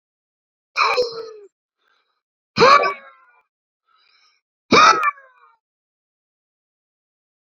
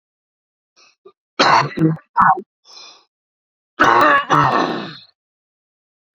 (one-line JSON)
{"exhalation_length": "7.6 s", "exhalation_amplitude": 32086, "exhalation_signal_mean_std_ratio": 0.29, "cough_length": "6.1 s", "cough_amplitude": 30705, "cough_signal_mean_std_ratio": 0.43, "survey_phase": "alpha (2021-03-01 to 2021-08-12)", "age": "18-44", "gender": "Male", "wearing_mask": "No", "symptom_change_to_sense_of_smell_or_taste": true, "symptom_onset": "2 days", "smoker_status": "Current smoker (e-cigarettes or vapes only)", "respiratory_condition_asthma": false, "respiratory_condition_other": false, "recruitment_source": "Test and Trace", "submission_delay": "1 day", "covid_test_result": "Positive", "covid_test_method": "LFT"}